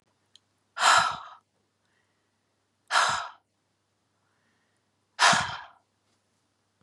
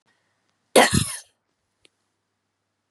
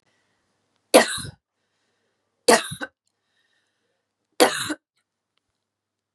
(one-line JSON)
{"exhalation_length": "6.8 s", "exhalation_amplitude": 16033, "exhalation_signal_mean_std_ratio": 0.3, "cough_length": "2.9 s", "cough_amplitude": 31403, "cough_signal_mean_std_ratio": 0.24, "three_cough_length": "6.1 s", "three_cough_amplitude": 32627, "three_cough_signal_mean_std_ratio": 0.22, "survey_phase": "beta (2021-08-13 to 2022-03-07)", "age": "45-64", "gender": "Female", "wearing_mask": "No", "symptom_runny_or_blocked_nose": true, "symptom_sore_throat": true, "symptom_fatigue": true, "symptom_change_to_sense_of_smell_or_taste": true, "symptom_loss_of_taste": true, "symptom_onset": "2 days", "smoker_status": "Never smoked", "respiratory_condition_asthma": false, "respiratory_condition_other": false, "recruitment_source": "Test and Trace", "submission_delay": "1 day", "covid_test_result": "Positive", "covid_test_method": "RT-qPCR", "covid_ct_value": 27.7, "covid_ct_gene": "ORF1ab gene"}